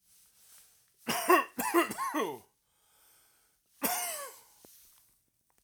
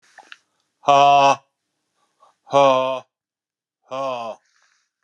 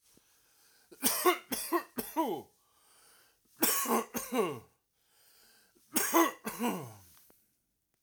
{"cough_length": "5.6 s", "cough_amplitude": 10110, "cough_signal_mean_std_ratio": 0.38, "exhalation_length": "5.0 s", "exhalation_amplitude": 29388, "exhalation_signal_mean_std_ratio": 0.38, "three_cough_length": "8.0 s", "three_cough_amplitude": 9527, "three_cough_signal_mean_std_ratio": 0.43, "survey_phase": "alpha (2021-03-01 to 2021-08-12)", "age": "45-64", "gender": "Male", "wearing_mask": "No", "symptom_none": true, "symptom_onset": "13 days", "smoker_status": "Never smoked", "respiratory_condition_asthma": false, "respiratory_condition_other": false, "recruitment_source": "REACT", "submission_delay": "1 day", "covid_test_result": "Negative", "covid_test_method": "RT-qPCR"}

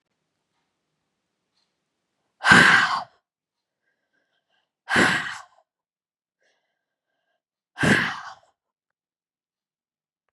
{"exhalation_length": "10.3 s", "exhalation_amplitude": 32129, "exhalation_signal_mean_std_ratio": 0.26, "survey_phase": "beta (2021-08-13 to 2022-03-07)", "age": "65+", "gender": "Female", "wearing_mask": "No", "symptom_none": true, "smoker_status": "Never smoked", "respiratory_condition_asthma": false, "respiratory_condition_other": false, "recruitment_source": "REACT", "submission_delay": "2 days", "covid_test_result": "Negative", "covid_test_method": "RT-qPCR"}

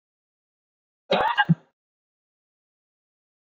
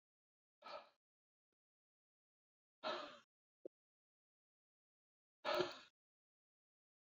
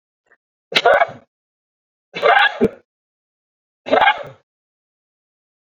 {"cough_length": "3.5 s", "cough_amplitude": 15096, "cough_signal_mean_std_ratio": 0.24, "exhalation_length": "7.2 s", "exhalation_amplitude": 1582, "exhalation_signal_mean_std_ratio": 0.23, "three_cough_length": "5.7 s", "three_cough_amplitude": 32768, "three_cough_signal_mean_std_ratio": 0.33, "survey_phase": "beta (2021-08-13 to 2022-03-07)", "age": "65+", "gender": "Male", "wearing_mask": "No", "symptom_runny_or_blocked_nose": true, "symptom_onset": "8 days", "smoker_status": "Ex-smoker", "respiratory_condition_asthma": false, "respiratory_condition_other": false, "recruitment_source": "REACT", "submission_delay": "1 day", "covid_test_result": "Negative", "covid_test_method": "RT-qPCR"}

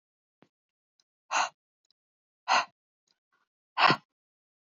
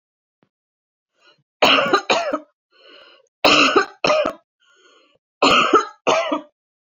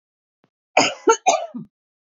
{"exhalation_length": "4.6 s", "exhalation_amplitude": 13050, "exhalation_signal_mean_std_ratio": 0.24, "three_cough_length": "7.0 s", "three_cough_amplitude": 27345, "three_cough_signal_mean_std_ratio": 0.44, "cough_length": "2.0 s", "cough_amplitude": 27501, "cough_signal_mean_std_ratio": 0.36, "survey_phase": "beta (2021-08-13 to 2022-03-07)", "age": "45-64", "gender": "Female", "wearing_mask": "No", "symptom_change_to_sense_of_smell_or_taste": true, "symptom_onset": "13 days", "smoker_status": "Ex-smoker", "respiratory_condition_asthma": false, "respiratory_condition_other": false, "recruitment_source": "REACT", "submission_delay": "5 days", "covid_test_result": "Negative", "covid_test_method": "RT-qPCR"}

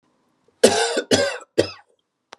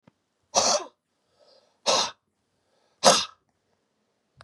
{"three_cough_length": "2.4 s", "three_cough_amplitude": 32100, "three_cough_signal_mean_std_ratio": 0.4, "exhalation_length": "4.4 s", "exhalation_amplitude": 27254, "exhalation_signal_mean_std_ratio": 0.3, "survey_phase": "beta (2021-08-13 to 2022-03-07)", "age": "45-64", "gender": "Male", "wearing_mask": "No", "symptom_sore_throat": true, "smoker_status": "Ex-smoker", "respiratory_condition_asthma": false, "respiratory_condition_other": false, "recruitment_source": "REACT", "submission_delay": "2 days", "covid_test_result": "Negative", "covid_test_method": "RT-qPCR", "influenza_a_test_result": "Unknown/Void", "influenza_b_test_result": "Unknown/Void"}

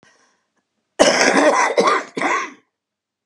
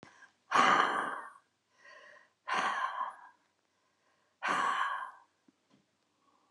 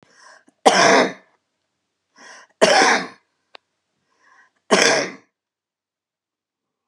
{"cough_length": "3.3 s", "cough_amplitude": 32767, "cough_signal_mean_std_ratio": 0.53, "exhalation_length": "6.5 s", "exhalation_amplitude": 9008, "exhalation_signal_mean_std_ratio": 0.43, "three_cough_length": "6.9 s", "three_cough_amplitude": 32768, "three_cough_signal_mean_std_ratio": 0.34, "survey_phase": "beta (2021-08-13 to 2022-03-07)", "age": "65+", "gender": "Female", "wearing_mask": "No", "symptom_cough_any": true, "symptom_fatigue": true, "smoker_status": "Current smoker (11 or more cigarettes per day)", "respiratory_condition_asthma": false, "respiratory_condition_other": true, "recruitment_source": "REACT", "submission_delay": "2 days", "covid_test_result": "Negative", "covid_test_method": "RT-qPCR", "influenza_a_test_result": "Negative", "influenza_b_test_result": "Negative"}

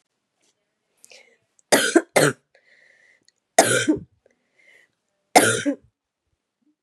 {"three_cough_length": "6.8 s", "three_cough_amplitude": 32768, "three_cough_signal_mean_std_ratio": 0.3, "survey_phase": "beta (2021-08-13 to 2022-03-07)", "age": "45-64", "gender": "Female", "wearing_mask": "No", "symptom_cough_any": true, "symptom_runny_or_blocked_nose": true, "symptom_sore_throat": true, "symptom_fatigue": true, "symptom_headache": true, "smoker_status": "Never smoked", "respiratory_condition_asthma": false, "respiratory_condition_other": false, "recruitment_source": "Test and Trace", "submission_delay": "2 days", "covid_test_result": "Positive", "covid_test_method": "RT-qPCR", "covid_ct_value": 22.0, "covid_ct_gene": "S gene", "covid_ct_mean": 22.4, "covid_viral_load": "44000 copies/ml", "covid_viral_load_category": "Low viral load (10K-1M copies/ml)"}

